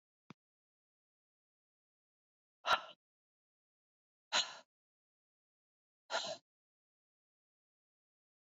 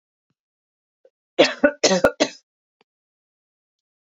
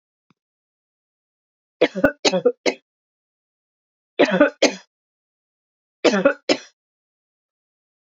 {"exhalation_length": "8.4 s", "exhalation_amplitude": 3931, "exhalation_signal_mean_std_ratio": 0.18, "cough_length": "4.1 s", "cough_amplitude": 27382, "cough_signal_mean_std_ratio": 0.26, "three_cough_length": "8.2 s", "three_cough_amplitude": 32241, "three_cough_signal_mean_std_ratio": 0.28, "survey_phase": "beta (2021-08-13 to 2022-03-07)", "age": "45-64", "gender": "Female", "wearing_mask": "No", "symptom_cough_any": true, "symptom_fatigue": true, "symptom_onset": "2 days", "smoker_status": "Never smoked", "respiratory_condition_asthma": false, "respiratory_condition_other": false, "recruitment_source": "Test and Trace", "submission_delay": "2 days", "covid_test_result": "Positive", "covid_test_method": "RT-qPCR", "covid_ct_value": 24.4, "covid_ct_gene": "N gene"}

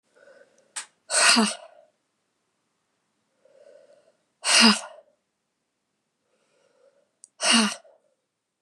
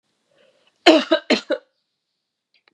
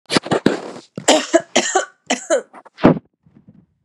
{"exhalation_length": "8.6 s", "exhalation_amplitude": 24379, "exhalation_signal_mean_std_ratio": 0.28, "cough_length": "2.7 s", "cough_amplitude": 32705, "cough_signal_mean_std_ratio": 0.28, "three_cough_length": "3.8 s", "three_cough_amplitude": 32768, "three_cough_signal_mean_std_ratio": 0.43, "survey_phase": "beta (2021-08-13 to 2022-03-07)", "age": "45-64", "gender": "Female", "wearing_mask": "No", "symptom_cough_any": true, "symptom_runny_or_blocked_nose": true, "symptom_diarrhoea": true, "symptom_fatigue": true, "symptom_headache": true, "symptom_change_to_sense_of_smell_or_taste": true, "symptom_onset": "2 days", "smoker_status": "Never smoked", "respiratory_condition_asthma": false, "respiratory_condition_other": false, "recruitment_source": "Test and Trace", "submission_delay": "1 day", "covid_test_result": "Negative", "covid_test_method": "RT-qPCR"}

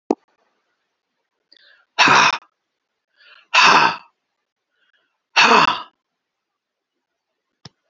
{"exhalation_length": "7.9 s", "exhalation_amplitude": 31655, "exhalation_signal_mean_std_ratio": 0.31, "survey_phase": "beta (2021-08-13 to 2022-03-07)", "age": "65+", "gender": "Male", "wearing_mask": "No", "symptom_none": true, "smoker_status": "Never smoked", "respiratory_condition_asthma": false, "respiratory_condition_other": false, "recruitment_source": "REACT", "submission_delay": "1 day", "covid_test_result": "Negative", "covid_test_method": "RT-qPCR", "influenza_a_test_result": "Unknown/Void", "influenza_b_test_result": "Unknown/Void"}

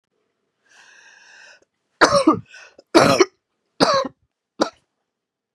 {"three_cough_length": "5.5 s", "three_cough_amplitude": 32768, "three_cough_signal_mean_std_ratio": 0.32, "survey_phase": "beta (2021-08-13 to 2022-03-07)", "age": "65+", "gender": "Female", "wearing_mask": "No", "symptom_cough_any": true, "symptom_runny_or_blocked_nose": true, "symptom_shortness_of_breath": true, "symptom_fatigue": true, "symptom_headache": true, "symptom_other": true, "symptom_onset": "3 days", "smoker_status": "Ex-smoker", "respiratory_condition_asthma": false, "respiratory_condition_other": false, "recruitment_source": "Test and Trace", "submission_delay": "1 day", "covid_test_result": "Positive", "covid_test_method": "RT-qPCR", "covid_ct_value": 23.9, "covid_ct_gene": "N gene", "covid_ct_mean": 24.2, "covid_viral_load": "12000 copies/ml", "covid_viral_load_category": "Low viral load (10K-1M copies/ml)"}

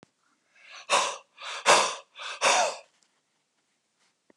{"exhalation_length": "4.4 s", "exhalation_amplitude": 19770, "exhalation_signal_mean_std_ratio": 0.38, "survey_phase": "beta (2021-08-13 to 2022-03-07)", "age": "65+", "gender": "Male", "wearing_mask": "No", "symptom_none": true, "smoker_status": "Ex-smoker", "respiratory_condition_asthma": false, "respiratory_condition_other": false, "recruitment_source": "REACT", "submission_delay": "0 days", "covid_test_result": "Negative", "covid_test_method": "RT-qPCR"}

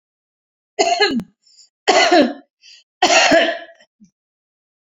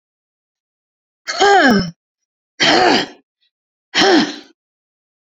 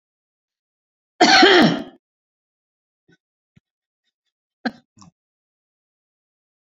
{"three_cough_length": "4.9 s", "three_cough_amplitude": 32655, "three_cough_signal_mean_std_ratio": 0.44, "exhalation_length": "5.3 s", "exhalation_amplitude": 32767, "exhalation_signal_mean_std_ratio": 0.43, "cough_length": "6.7 s", "cough_amplitude": 30123, "cough_signal_mean_std_ratio": 0.24, "survey_phase": "beta (2021-08-13 to 2022-03-07)", "age": "65+", "gender": "Female", "wearing_mask": "No", "symptom_diarrhoea": true, "smoker_status": "Never smoked", "respiratory_condition_asthma": false, "respiratory_condition_other": false, "recruitment_source": "REACT", "submission_delay": "2 days", "covid_test_result": "Negative", "covid_test_method": "RT-qPCR"}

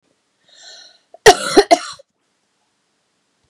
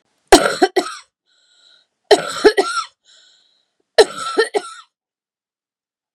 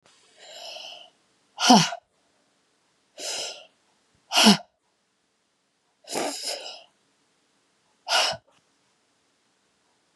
{"cough_length": "3.5 s", "cough_amplitude": 32768, "cough_signal_mean_std_ratio": 0.23, "three_cough_length": "6.1 s", "three_cough_amplitude": 32768, "three_cough_signal_mean_std_ratio": 0.31, "exhalation_length": "10.2 s", "exhalation_amplitude": 27590, "exhalation_signal_mean_std_ratio": 0.27, "survey_phase": "beta (2021-08-13 to 2022-03-07)", "age": "45-64", "gender": "Female", "wearing_mask": "No", "symptom_new_continuous_cough": true, "symptom_runny_or_blocked_nose": true, "symptom_shortness_of_breath": true, "symptom_abdominal_pain": true, "symptom_onset": "4 days", "smoker_status": "Ex-smoker", "respiratory_condition_asthma": false, "respiratory_condition_other": false, "recruitment_source": "Test and Trace", "submission_delay": "1 day", "covid_test_result": "Positive", "covid_test_method": "RT-qPCR", "covid_ct_value": 23.1, "covid_ct_gene": "ORF1ab gene"}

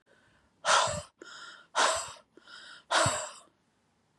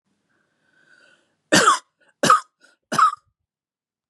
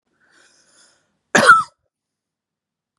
{"exhalation_length": "4.2 s", "exhalation_amplitude": 8704, "exhalation_signal_mean_std_ratio": 0.42, "three_cough_length": "4.1 s", "three_cough_amplitude": 29543, "three_cough_signal_mean_std_ratio": 0.31, "cough_length": "3.0 s", "cough_amplitude": 32749, "cough_signal_mean_std_ratio": 0.24, "survey_phase": "beta (2021-08-13 to 2022-03-07)", "age": "45-64", "gender": "Female", "wearing_mask": "No", "symptom_runny_or_blocked_nose": true, "symptom_onset": "8 days", "smoker_status": "Current smoker (e-cigarettes or vapes only)", "respiratory_condition_asthma": false, "respiratory_condition_other": false, "recruitment_source": "REACT", "submission_delay": "1 day", "covid_test_result": "Negative", "covid_test_method": "RT-qPCR", "influenza_a_test_result": "Negative", "influenza_b_test_result": "Negative"}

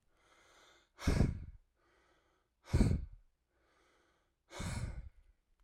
{"exhalation_length": "5.6 s", "exhalation_amplitude": 5099, "exhalation_signal_mean_std_ratio": 0.33, "survey_phase": "alpha (2021-03-01 to 2021-08-12)", "age": "18-44", "gender": "Male", "wearing_mask": "No", "symptom_cough_any": true, "symptom_headache": true, "symptom_onset": "8 days", "smoker_status": "Never smoked", "respiratory_condition_asthma": false, "respiratory_condition_other": false, "recruitment_source": "Test and Trace", "submission_delay": "1 day", "covid_test_result": "Positive", "covid_test_method": "RT-qPCR"}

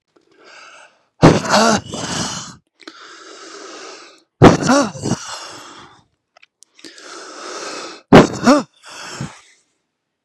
{"exhalation_length": "10.2 s", "exhalation_amplitude": 32768, "exhalation_signal_mean_std_ratio": 0.35, "survey_phase": "beta (2021-08-13 to 2022-03-07)", "age": "45-64", "gender": "Male", "wearing_mask": "No", "symptom_sore_throat": true, "symptom_headache": true, "symptom_other": true, "smoker_status": "Never smoked", "respiratory_condition_asthma": false, "respiratory_condition_other": false, "recruitment_source": "Test and Trace", "submission_delay": "2 days", "covid_test_result": "Positive", "covid_test_method": "RT-qPCR", "covid_ct_value": 19.2, "covid_ct_gene": "ORF1ab gene", "covid_ct_mean": 19.9, "covid_viral_load": "290000 copies/ml", "covid_viral_load_category": "Low viral load (10K-1M copies/ml)"}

